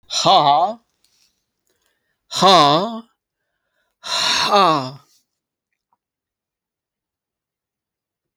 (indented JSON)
{
  "exhalation_length": "8.4 s",
  "exhalation_amplitude": 31024,
  "exhalation_signal_mean_std_ratio": 0.38,
  "survey_phase": "beta (2021-08-13 to 2022-03-07)",
  "age": "65+",
  "gender": "Male",
  "wearing_mask": "No",
  "symptom_none": true,
  "smoker_status": "Never smoked",
  "respiratory_condition_asthma": false,
  "respiratory_condition_other": false,
  "recruitment_source": "REACT",
  "submission_delay": "1 day",
  "covid_test_result": "Negative",
  "covid_test_method": "RT-qPCR"
}